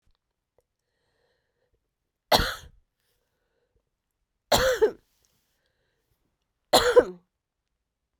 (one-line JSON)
{"three_cough_length": "8.2 s", "three_cough_amplitude": 23908, "three_cough_signal_mean_std_ratio": 0.24, "survey_phase": "beta (2021-08-13 to 2022-03-07)", "age": "45-64", "gender": "Female", "wearing_mask": "No", "symptom_cough_any": true, "symptom_runny_or_blocked_nose": true, "symptom_fatigue": true, "symptom_headache": true, "symptom_change_to_sense_of_smell_or_taste": true, "symptom_loss_of_taste": true, "symptom_onset": "4 days", "smoker_status": "Ex-smoker", "respiratory_condition_asthma": false, "respiratory_condition_other": false, "recruitment_source": "Test and Trace", "submission_delay": "3 days", "covid_test_result": "Positive", "covid_test_method": "LAMP"}